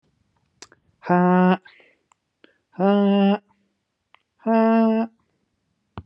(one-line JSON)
{"exhalation_length": "6.1 s", "exhalation_amplitude": 20366, "exhalation_signal_mean_std_ratio": 0.43, "survey_phase": "beta (2021-08-13 to 2022-03-07)", "age": "18-44", "gender": "Male", "wearing_mask": "No", "symptom_headache": true, "symptom_onset": "4 days", "smoker_status": "Never smoked", "respiratory_condition_asthma": false, "respiratory_condition_other": false, "recruitment_source": "REACT", "submission_delay": "4 days", "covid_test_result": "Negative", "covid_test_method": "RT-qPCR", "influenza_a_test_result": "Negative", "influenza_b_test_result": "Negative"}